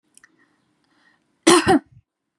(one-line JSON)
{"cough_length": "2.4 s", "cough_amplitude": 30574, "cough_signal_mean_std_ratio": 0.29, "survey_phase": "beta (2021-08-13 to 2022-03-07)", "age": "18-44", "gender": "Female", "wearing_mask": "No", "symptom_runny_or_blocked_nose": true, "symptom_sore_throat": true, "symptom_fatigue": true, "symptom_fever_high_temperature": true, "symptom_onset": "3 days", "smoker_status": "Never smoked", "respiratory_condition_asthma": false, "respiratory_condition_other": false, "recruitment_source": "Test and Trace", "submission_delay": "-2 days", "covid_test_result": "Positive", "covid_test_method": "RT-qPCR", "covid_ct_value": 18.2, "covid_ct_gene": "N gene", "covid_ct_mean": 19.0, "covid_viral_load": "570000 copies/ml", "covid_viral_load_category": "Low viral load (10K-1M copies/ml)"}